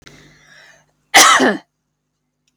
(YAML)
cough_length: 2.6 s
cough_amplitude: 32768
cough_signal_mean_std_ratio: 0.34
survey_phase: alpha (2021-03-01 to 2021-08-12)
age: 45-64
gender: Female
wearing_mask: 'No'
symptom_diarrhoea: true
symptom_headache: true
smoker_status: Never smoked
respiratory_condition_asthma: false
respiratory_condition_other: false
recruitment_source: REACT
submission_delay: 2 days
covid_test_result: Negative
covid_test_method: RT-qPCR